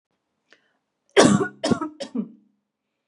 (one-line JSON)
{"cough_length": "3.1 s", "cough_amplitude": 32750, "cough_signal_mean_std_ratio": 0.33, "survey_phase": "beta (2021-08-13 to 2022-03-07)", "age": "18-44", "gender": "Female", "wearing_mask": "No", "symptom_cough_any": true, "smoker_status": "Never smoked", "respiratory_condition_asthma": false, "respiratory_condition_other": false, "recruitment_source": "REACT", "submission_delay": "1 day", "covid_test_result": "Negative", "covid_test_method": "RT-qPCR", "influenza_a_test_result": "Negative", "influenza_b_test_result": "Negative"}